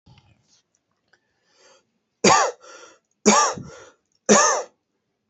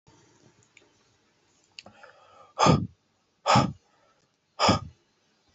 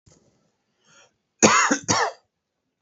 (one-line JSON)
{"three_cough_length": "5.3 s", "three_cough_amplitude": 28248, "three_cough_signal_mean_std_ratio": 0.33, "exhalation_length": "5.5 s", "exhalation_amplitude": 17267, "exhalation_signal_mean_std_ratio": 0.29, "cough_length": "2.8 s", "cough_amplitude": 28863, "cough_signal_mean_std_ratio": 0.35, "survey_phase": "alpha (2021-03-01 to 2021-08-12)", "age": "18-44", "gender": "Male", "wearing_mask": "No", "symptom_fatigue": true, "symptom_headache": true, "symptom_change_to_sense_of_smell_or_taste": true, "symptom_onset": "2 days", "smoker_status": "Ex-smoker", "respiratory_condition_asthma": false, "respiratory_condition_other": false, "recruitment_source": "Test and Trace", "submission_delay": "1 day", "covid_test_result": "Positive", "covid_test_method": "RT-qPCR", "covid_ct_value": 14.8, "covid_ct_gene": "ORF1ab gene", "covid_ct_mean": 15.8, "covid_viral_load": "6600000 copies/ml", "covid_viral_load_category": "High viral load (>1M copies/ml)"}